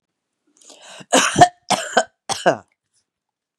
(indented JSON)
{
  "cough_length": "3.6 s",
  "cough_amplitude": 32768,
  "cough_signal_mean_std_ratio": 0.32,
  "survey_phase": "beta (2021-08-13 to 2022-03-07)",
  "age": "45-64",
  "gender": "Female",
  "wearing_mask": "No",
  "symptom_change_to_sense_of_smell_or_taste": true,
  "smoker_status": "Ex-smoker",
  "respiratory_condition_asthma": false,
  "respiratory_condition_other": false,
  "recruitment_source": "REACT",
  "submission_delay": "7 days",
  "covid_test_result": "Negative",
  "covid_test_method": "RT-qPCR"
}